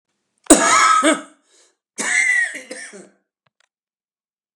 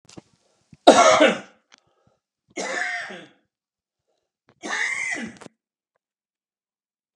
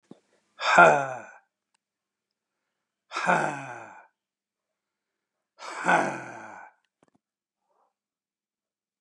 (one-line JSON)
{"cough_length": "4.6 s", "cough_amplitude": 32768, "cough_signal_mean_std_ratio": 0.42, "three_cough_length": "7.2 s", "three_cough_amplitude": 32768, "three_cough_signal_mean_std_ratio": 0.29, "exhalation_length": "9.0 s", "exhalation_amplitude": 23871, "exhalation_signal_mean_std_ratio": 0.27, "survey_phase": "beta (2021-08-13 to 2022-03-07)", "age": "45-64", "gender": "Male", "wearing_mask": "No", "symptom_none": true, "symptom_onset": "6 days", "smoker_status": "Never smoked", "respiratory_condition_asthma": false, "respiratory_condition_other": false, "recruitment_source": "REACT", "submission_delay": "3 days", "covid_test_result": "Negative", "covid_test_method": "RT-qPCR", "influenza_a_test_result": "Unknown/Void", "influenza_b_test_result": "Unknown/Void"}